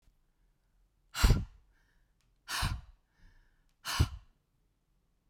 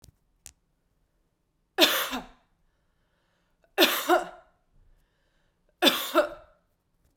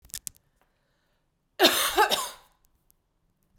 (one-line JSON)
{"exhalation_length": "5.3 s", "exhalation_amplitude": 9437, "exhalation_signal_mean_std_ratio": 0.27, "three_cough_length": "7.2 s", "three_cough_amplitude": 21559, "three_cough_signal_mean_std_ratio": 0.3, "cough_length": "3.6 s", "cough_amplitude": 24744, "cough_signal_mean_std_ratio": 0.31, "survey_phase": "beta (2021-08-13 to 2022-03-07)", "age": "18-44", "gender": "Female", "wearing_mask": "No", "symptom_runny_or_blocked_nose": true, "symptom_headache": true, "symptom_change_to_sense_of_smell_or_taste": true, "symptom_loss_of_taste": true, "smoker_status": "Ex-smoker", "respiratory_condition_asthma": false, "respiratory_condition_other": false, "recruitment_source": "Test and Trace", "submission_delay": "1 day", "covid_test_result": "Positive", "covid_test_method": "RT-qPCR", "covid_ct_value": 26.4, "covid_ct_gene": "ORF1ab gene", "covid_ct_mean": 27.1, "covid_viral_load": "1200 copies/ml", "covid_viral_load_category": "Minimal viral load (< 10K copies/ml)"}